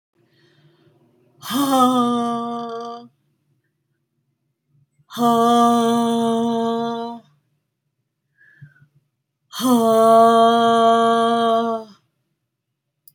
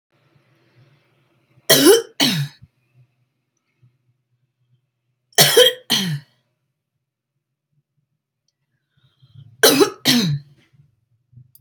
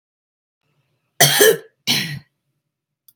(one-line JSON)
{"exhalation_length": "13.1 s", "exhalation_amplitude": 23768, "exhalation_signal_mean_std_ratio": 0.55, "three_cough_length": "11.6 s", "three_cough_amplitude": 32768, "three_cough_signal_mean_std_ratio": 0.3, "cough_length": "3.2 s", "cough_amplitude": 32768, "cough_signal_mean_std_ratio": 0.33, "survey_phase": "alpha (2021-03-01 to 2021-08-12)", "age": "45-64", "gender": "Female", "wearing_mask": "No", "symptom_none": true, "smoker_status": "Ex-smoker", "respiratory_condition_asthma": false, "respiratory_condition_other": false, "recruitment_source": "REACT", "submission_delay": "5 days", "covid_test_result": "Negative", "covid_test_method": "RT-qPCR"}